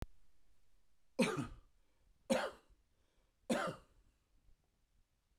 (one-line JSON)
{"three_cough_length": "5.4 s", "three_cough_amplitude": 2886, "three_cough_signal_mean_std_ratio": 0.34, "survey_phase": "beta (2021-08-13 to 2022-03-07)", "age": "45-64", "gender": "Male", "wearing_mask": "No", "symptom_none": true, "smoker_status": "Ex-smoker", "respiratory_condition_asthma": false, "respiratory_condition_other": false, "recruitment_source": "REACT", "submission_delay": "1 day", "covid_test_result": "Negative", "covid_test_method": "RT-qPCR"}